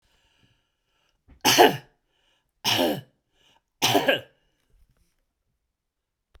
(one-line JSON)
{"three_cough_length": "6.4 s", "three_cough_amplitude": 29381, "three_cough_signal_mean_std_ratio": 0.29, "survey_phase": "beta (2021-08-13 to 2022-03-07)", "age": "65+", "gender": "Male", "wearing_mask": "No", "symptom_cough_any": true, "smoker_status": "Never smoked", "respiratory_condition_asthma": false, "respiratory_condition_other": false, "recruitment_source": "REACT", "submission_delay": "1 day", "covid_test_result": "Negative", "covid_test_method": "RT-qPCR"}